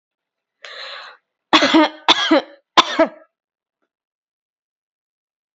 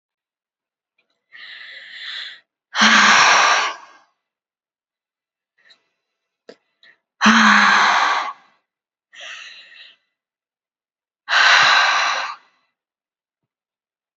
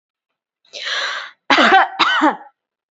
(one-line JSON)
{"three_cough_length": "5.5 s", "three_cough_amplitude": 30141, "three_cough_signal_mean_std_ratio": 0.31, "exhalation_length": "14.2 s", "exhalation_amplitude": 32767, "exhalation_signal_mean_std_ratio": 0.4, "cough_length": "2.9 s", "cough_amplitude": 29500, "cough_signal_mean_std_ratio": 0.49, "survey_phase": "beta (2021-08-13 to 2022-03-07)", "age": "18-44", "gender": "Female", "wearing_mask": "No", "symptom_none": true, "smoker_status": "Never smoked", "respiratory_condition_asthma": false, "respiratory_condition_other": false, "recruitment_source": "REACT", "submission_delay": "1 day", "covid_test_result": "Negative", "covid_test_method": "RT-qPCR"}